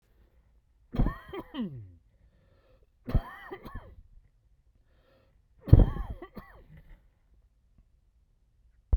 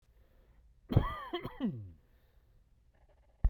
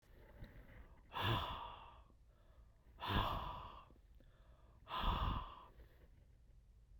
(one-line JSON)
{"three_cough_length": "9.0 s", "three_cough_amplitude": 25986, "three_cough_signal_mean_std_ratio": 0.22, "cough_length": "3.5 s", "cough_amplitude": 7196, "cough_signal_mean_std_ratio": 0.32, "exhalation_length": "7.0 s", "exhalation_amplitude": 2324, "exhalation_signal_mean_std_ratio": 0.51, "survey_phase": "beta (2021-08-13 to 2022-03-07)", "age": "45-64", "gender": "Male", "wearing_mask": "No", "symptom_shortness_of_breath": true, "symptom_fatigue": true, "symptom_onset": "12 days", "smoker_status": "Never smoked", "respiratory_condition_asthma": false, "respiratory_condition_other": false, "recruitment_source": "REACT", "submission_delay": "6 days", "covid_test_result": "Negative", "covid_test_method": "RT-qPCR", "influenza_a_test_result": "Negative", "influenza_b_test_result": "Negative"}